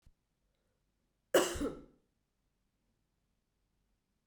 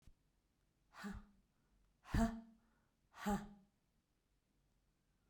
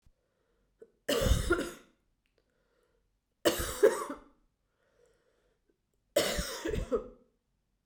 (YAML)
cough_length: 4.3 s
cough_amplitude: 5207
cough_signal_mean_std_ratio: 0.21
exhalation_length: 5.3 s
exhalation_amplitude: 1945
exhalation_signal_mean_std_ratio: 0.28
three_cough_length: 7.9 s
three_cough_amplitude: 9049
three_cough_signal_mean_std_ratio: 0.36
survey_phase: beta (2021-08-13 to 2022-03-07)
age: 45-64
gender: Female
wearing_mask: 'No'
symptom_cough_any: true
symptom_runny_or_blocked_nose: true
symptom_shortness_of_breath: true
symptom_abdominal_pain: true
symptom_fatigue: true
symptom_fever_high_temperature: true
symptom_headache: true
symptom_onset: 4 days
smoker_status: Ex-smoker
respiratory_condition_asthma: false
respiratory_condition_other: false
recruitment_source: Test and Trace
submission_delay: 2 days
covid_test_result: Positive
covid_test_method: RT-qPCR
covid_ct_value: 15.6
covid_ct_gene: ORF1ab gene
covid_ct_mean: 16.0
covid_viral_load: 5500000 copies/ml
covid_viral_load_category: High viral load (>1M copies/ml)